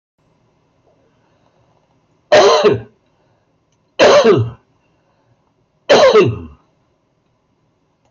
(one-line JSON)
{"three_cough_length": "8.1 s", "three_cough_amplitude": 27544, "three_cough_signal_mean_std_ratio": 0.37, "survey_phase": "beta (2021-08-13 to 2022-03-07)", "age": "65+", "gender": "Male", "wearing_mask": "No", "symptom_none": true, "symptom_onset": "12 days", "smoker_status": "Never smoked", "respiratory_condition_asthma": false, "respiratory_condition_other": false, "recruitment_source": "REACT", "submission_delay": "3 days", "covid_test_result": "Negative", "covid_test_method": "RT-qPCR", "influenza_a_test_result": "Negative", "influenza_b_test_result": "Negative"}